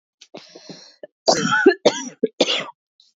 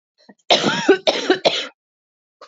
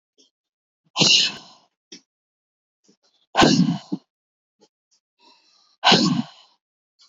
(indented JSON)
{
  "three_cough_length": "3.2 s",
  "three_cough_amplitude": 26824,
  "three_cough_signal_mean_std_ratio": 0.4,
  "cough_length": "2.5 s",
  "cough_amplitude": 29129,
  "cough_signal_mean_std_ratio": 0.45,
  "exhalation_length": "7.1 s",
  "exhalation_amplitude": 29940,
  "exhalation_signal_mean_std_ratio": 0.32,
  "survey_phase": "beta (2021-08-13 to 2022-03-07)",
  "age": "18-44",
  "gender": "Female",
  "wearing_mask": "No",
  "symptom_none": true,
  "smoker_status": "Ex-smoker",
  "respiratory_condition_asthma": false,
  "respiratory_condition_other": true,
  "recruitment_source": "REACT",
  "submission_delay": "1 day",
  "covid_test_result": "Negative",
  "covid_test_method": "RT-qPCR",
  "influenza_a_test_result": "Negative",
  "influenza_b_test_result": "Negative"
}